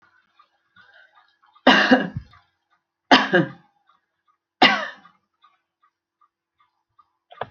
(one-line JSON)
{"three_cough_length": "7.5 s", "three_cough_amplitude": 31922, "three_cough_signal_mean_std_ratio": 0.27, "survey_phase": "alpha (2021-03-01 to 2021-08-12)", "age": "65+", "gender": "Female", "wearing_mask": "No", "symptom_fatigue": true, "symptom_headache": true, "smoker_status": "Ex-smoker", "respiratory_condition_asthma": false, "respiratory_condition_other": false, "recruitment_source": "REACT", "submission_delay": "2 days", "covid_test_result": "Negative", "covid_test_method": "RT-qPCR"}